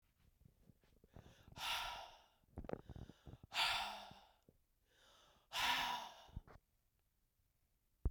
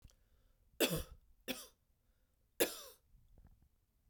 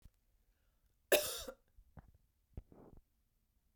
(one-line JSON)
{"exhalation_length": "8.1 s", "exhalation_amplitude": 1744, "exhalation_signal_mean_std_ratio": 0.4, "three_cough_length": "4.1 s", "three_cough_amplitude": 3693, "three_cough_signal_mean_std_ratio": 0.28, "cough_length": "3.8 s", "cough_amplitude": 4959, "cough_signal_mean_std_ratio": 0.22, "survey_phase": "beta (2021-08-13 to 2022-03-07)", "age": "45-64", "gender": "Female", "wearing_mask": "No", "symptom_cough_any": true, "symptom_runny_or_blocked_nose": true, "symptom_sore_throat": true, "symptom_fatigue": true, "symptom_fever_high_temperature": true, "symptom_headache": true, "smoker_status": "Never smoked", "respiratory_condition_asthma": false, "respiratory_condition_other": false, "recruitment_source": "Test and Trace", "submission_delay": "2 days", "covid_test_result": "Positive", "covid_test_method": "RT-qPCR"}